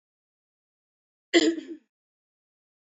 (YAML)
cough_length: 2.9 s
cough_amplitude: 13531
cough_signal_mean_std_ratio: 0.23
survey_phase: alpha (2021-03-01 to 2021-08-12)
age: 18-44
gender: Female
wearing_mask: 'No'
symptom_cough_any: true
symptom_fatigue: true
symptom_change_to_sense_of_smell_or_taste: true
symptom_loss_of_taste: true
symptom_onset: 8 days
smoker_status: Never smoked
respiratory_condition_asthma: false
respiratory_condition_other: false
recruitment_source: Test and Trace
submission_delay: 3 days
covid_test_result: Positive
covid_test_method: RT-qPCR
covid_ct_value: 21.5
covid_ct_gene: ORF1ab gene